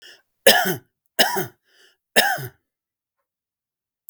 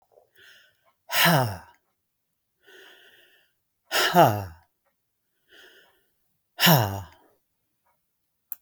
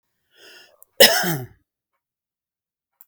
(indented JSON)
{
  "three_cough_length": "4.1 s",
  "three_cough_amplitude": 32768,
  "three_cough_signal_mean_std_ratio": 0.31,
  "exhalation_length": "8.6 s",
  "exhalation_amplitude": 24375,
  "exhalation_signal_mean_std_ratio": 0.3,
  "cough_length": "3.1 s",
  "cough_amplitude": 32768,
  "cough_signal_mean_std_ratio": 0.24,
  "survey_phase": "beta (2021-08-13 to 2022-03-07)",
  "age": "65+",
  "gender": "Male",
  "wearing_mask": "No",
  "symptom_none": true,
  "smoker_status": "Never smoked",
  "respiratory_condition_asthma": false,
  "respiratory_condition_other": false,
  "recruitment_source": "REACT",
  "submission_delay": "2 days",
  "covid_test_result": "Negative",
  "covid_test_method": "RT-qPCR",
  "influenza_a_test_result": "Negative",
  "influenza_b_test_result": "Negative"
}